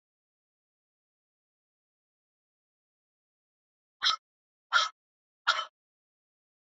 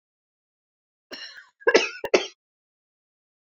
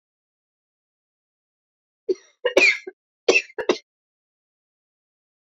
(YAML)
exhalation_length: 6.7 s
exhalation_amplitude: 9201
exhalation_signal_mean_std_ratio: 0.19
cough_length: 3.5 s
cough_amplitude: 25421
cough_signal_mean_std_ratio: 0.23
three_cough_length: 5.5 s
three_cough_amplitude: 26326
three_cough_signal_mean_std_ratio: 0.24
survey_phase: beta (2021-08-13 to 2022-03-07)
age: 45-64
gender: Female
wearing_mask: 'No'
symptom_cough_any: true
symptom_fatigue: true
symptom_fever_high_temperature: true
symptom_change_to_sense_of_smell_or_taste: true
symptom_loss_of_taste: true
symptom_onset: 6 days
smoker_status: Never smoked
respiratory_condition_asthma: true
respiratory_condition_other: false
recruitment_source: Test and Trace
submission_delay: 1 day
covid_test_result: Positive
covid_test_method: RT-qPCR
covid_ct_value: 16.8
covid_ct_gene: ORF1ab gene
covid_ct_mean: 17.9
covid_viral_load: 1400000 copies/ml
covid_viral_load_category: High viral load (>1M copies/ml)